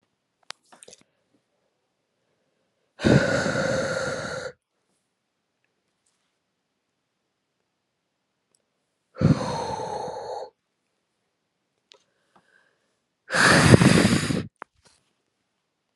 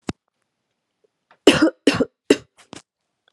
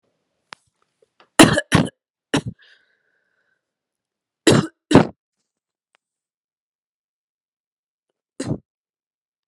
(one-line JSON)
{"exhalation_length": "16.0 s", "exhalation_amplitude": 32768, "exhalation_signal_mean_std_ratio": 0.31, "three_cough_length": "3.3 s", "three_cough_amplitude": 32768, "three_cough_signal_mean_std_ratio": 0.26, "cough_length": "9.5 s", "cough_amplitude": 32768, "cough_signal_mean_std_ratio": 0.21, "survey_phase": "alpha (2021-03-01 to 2021-08-12)", "age": "18-44", "gender": "Female", "wearing_mask": "Yes", "symptom_none": true, "smoker_status": "Ex-smoker", "respiratory_condition_asthma": false, "respiratory_condition_other": false, "recruitment_source": "REACT", "submission_delay": "2 days", "covid_test_result": "Negative", "covid_test_method": "RT-qPCR"}